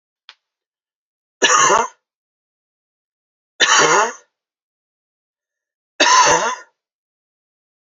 {"three_cough_length": "7.9 s", "three_cough_amplitude": 31791, "three_cough_signal_mean_std_ratio": 0.35, "survey_phase": "beta (2021-08-13 to 2022-03-07)", "age": "45-64", "gender": "Male", "wearing_mask": "No", "symptom_headache": true, "symptom_other": true, "symptom_onset": "5 days", "smoker_status": "Never smoked", "respiratory_condition_asthma": true, "respiratory_condition_other": false, "recruitment_source": "Test and Trace", "submission_delay": "2 days", "covid_test_result": "Positive", "covid_test_method": "RT-qPCR", "covid_ct_value": 28.6, "covid_ct_gene": "N gene"}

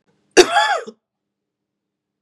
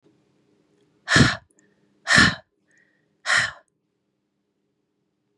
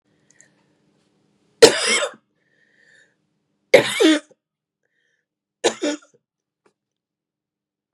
{"cough_length": "2.2 s", "cough_amplitude": 32768, "cough_signal_mean_std_ratio": 0.3, "exhalation_length": "5.4 s", "exhalation_amplitude": 29803, "exhalation_signal_mean_std_ratio": 0.28, "three_cough_length": "7.9 s", "three_cough_amplitude": 32768, "three_cough_signal_mean_std_ratio": 0.24, "survey_phase": "beta (2021-08-13 to 2022-03-07)", "age": "18-44", "gender": "Female", "wearing_mask": "No", "symptom_cough_any": true, "symptom_shortness_of_breath": true, "smoker_status": "Never smoked", "respiratory_condition_asthma": true, "respiratory_condition_other": false, "recruitment_source": "Test and Trace", "submission_delay": "1 day", "covid_test_result": "Positive", "covid_test_method": "RT-qPCR", "covid_ct_value": 27.9, "covid_ct_gene": "N gene"}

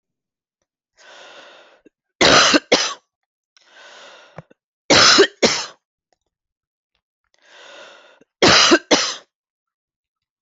{"three_cough_length": "10.4 s", "three_cough_amplitude": 32767, "three_cough_signal_mean_std_ratio": 0.33, "survey_phase": "alpha (2021-03-01 to 2021-08-12)", "age": "45-64", "gender": "Female", "wearing_mask": "No", "symptom_cough_any": true, "symptom_new_continuous_cough": true, "symptom_fatigue": true, "symptom_fever_high_temperature": true, "symptom_headache": true, "symptom_onset": "4 days", "smoker_status": "Never smoked", "respiratory_condition_asthma": false, "respiratory_condition_other": false, "recruitment_source": "Test and Trace", "submission_delay": "2 days", "covid_test_result": "Positive", "covid_test_method": "RT-qPCR"}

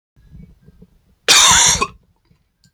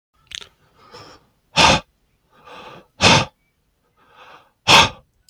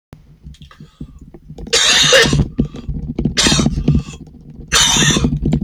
{"cough_length": "2.7 s", "cough_amplitude": 32768, "cough_signal_mean_std_ratio": 0.39, "exhalation_length": "5.3 s", "exhalation_amplitude": 32767, "exhalation_signal_mean_std_ratio": 0.3, "three_cough_length": "5.6 s", "three_cough_amplitude": 32768, "three_cough_signal_mean_std_ratio": 0.65, "survey_phase": "beta (2021-08-13 to 2022-03-07)", "age": "45-64", "gender": "Male", "wearing_mask": "No", "symptom_cough_any": true, "symptom_sore_throat": true, "symptom_fatigue": true, "symptom_fever_high_temperature": true, "symptom_headache": true, "smoker_status": "Ex-smoker", "respiratory_condition_asthma": false, "respiratory_condition_other": false, "recruitment_source": "Test and Trace", "submission_delay": "2 days", "covid_test_result": "Positive", "covid_test_method": "RT-qPCR", "covid_ct_value": 24.8, "covid_ct_gene": "ORF1ab gene", "covid_ct_mean": 25.5, "covid_viral_load": "4300 copies/ml", "covid_viral_load_category": "Minimal viral load (< 10K copies/ml)"}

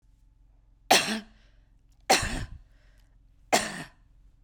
{"three_cough_length": "4.4 s", "three_cough_amplitude": 19955, "three_cough_signal_mean_std_ratio": 0.33, "survey_phase": "beta (2021-08-13 to 2022-03-07)", "age": "45-64", "gender": "Female", "wearing_mask": "No", "symptom_none": true, "smoker_status": "Never smoked", "respiratory_condition_asthma": false, "respiratory_condition_other": false, "recruitment_source": "REACT", "submission_delay": "3 days", "covid_test_result": "Negative", "covid_test_method": "RT-qPCR"}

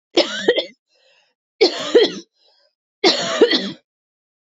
{"three_cough_length": "4.5 s", "three_cough_amplitude": 28080, "three_cough_signal_mean_std_ratio": 0.42, "survey_phase": "beta (2021-08-13 to 2022-03-07)", "age": "45-64", "gender": "Female", "wearing_mask": "No", "symptom_cough_any": true, "symptom_runny_or_blocked_nose": true, "symptom_sore_throat": true, "symptom_fatigue": true, "symptom_onset": "6 days", "smoker_status": "Never smoked", "respiratory_condition_asthma": false, "respiratory_condition_other": false, "recruitment_source": "Test and Trace", "submission_delay": "1 day", "covid_test_result": "Positive", "covid_test_method": "RT-qPCR", "covid_ct_value": 24.6, "covid_ct_gene": "N gene"}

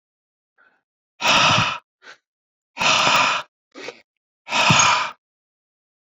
{"exhalation_length": "6.1 s", "exhalation_amplitude": 25686, "exhalation_signal_mean_std_ratio": 0.45, "survey_phase": "beta (2021-08-13 to 2022-03-07)", "age": "45-64", "gender": "Male", "wearing_mask": "No", "symptom_none": true, "smoker_status": "Current smoker (e-cigarettes or vapes only)", "respiratory_condition_asthma": true, "respiratory_condition_other": false, "recruitment_source": "REACT", "submission_delay": "1 day", "covid_test_result": "Negative", "covid_test_method": "RT-qPCR"}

